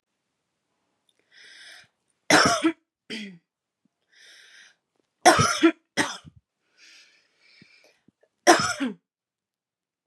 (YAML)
three_cough_length: 10.1 s
three_cough_amplitude: 31908
three_cough_signal_mean_std_ratio: 0.28
survey_phase: beta (2021-08-13 to 2022-03-07)
age: 18-44
gender: Female
wearing_mask: 'No'
symptom_none: true
smoker_status: Never smoked
respiratory_condition_asthma: false
respiratory_condition_other: false
recruitment_source: REACT
submission_delay: 4 days
covid_test_result: Negative
covid_test_method: RT-qPCR
influenza_a_test_result: Negative
influenza_b_test_result: Negative